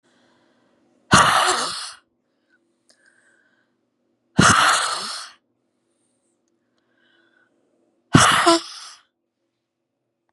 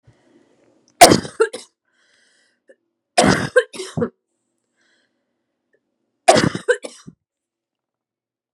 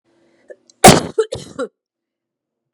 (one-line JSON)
{"exhalation_length": "10.3 s", "exhalation_amplitude": 32768, "exhalation_signal_mean_std_ratio": 0.32, "three_cough_length": "8.5 s", "three_cough_amplitude": 32768, "three_cough_signal_mean_std_ratio": 0.25, "cough_length": "2.7 s", "cough_amplitude": 32768, "cough_signal_mean_std_ratio": 0.25, "survey_phase": "beta (2021-08-13 to 2022-03-07)", "age": "18-44", "gender": "Female", "wearing_mask": "No", "symptom_fatigue": true, "symptom_headache": true, "symptom_change_to_sense_of_smell_or_taste": true, "symptom_onset": "12 days", "smoker_status": "Ex-smoker", "respiratory_condition_asthma": false, "respiratory_condition_other": false, "recruitment_source": "REACT", "submission_delay": "4 days", "covid_test_result": "Negative", "covid_test_method": "RT-qPCR", "influenza_a_test_result": "Negative", "influenza_b_test_result": "Negative"}